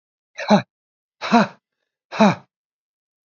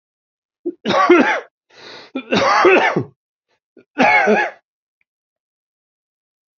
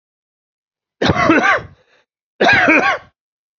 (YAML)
exhalation_length: 3.2 s
exhalation_amplitude: 29845
exhalation_signal_mean_std_ratio: 0.3
three_cough_length: 6.6 s
three_cough_amplitude: 31288
three_cough_signal_mean_std_ratio: 0.45
cough_length: 3.6 s
cough_amplitude: 30088
cough_signal_mean_std_ratio: 0.49
survey_phase: beta (2021-08-13 to 2022-03-07)
age: 45-64
gender: Male
wearing_mask: 'No'
symptom_cough_any: true
symptom_shortness_of_breath: true
symptom_fatigue: true
symptom_fever_high_temperature: true
symptom_headache: true
symptom_change_to_sense_of_smell_or_taste: true
symptom_onset: 3 days
smoker_status: Never smoked
respiratory_condition_asthma: true
respiratory_condition_other: false
recruitment_source: Test and Trace
submission_delay: 2 days
covid_test_result: Positive
covid_test_method: RT-qPCR
covid_ct_value: 20.3
covid_ct_gene: ORF1ab gene